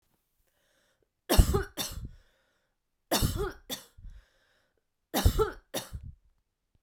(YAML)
three_cough_length: 6.8 s
three_cough_amplitude: 16884
three_cough_signal_mean_std_ratio: 0.32
survey_phase: beta (2021-08-13 to 2022-03-07)
age: 18-44
gender: Female
wearing_mask: 'No'
symptom_cough_any: true
symptom_runny_or_blocked_nose: true
symptom_abdominal_pain: true
symptom_fatigue: true
symptom_fever_high_temperature: true
symptom_onset: 3 days
smoker_status: Never smoked
respiratory_condition_asthma: false
respiratory_condition_other: false
recruitment_source: Test and Trace
submission_delay: 2 days
covid_test_result: Positive
covid_test_method: RT-qPCR
covid_ct_value: 16.1
covid_ct_gene: ORF1ab gene
covid_ct_mean: 16.4
covid_viral_load: 4100000 copies/ml
covid_viral_load_category: High viral load (>1M copies/ml)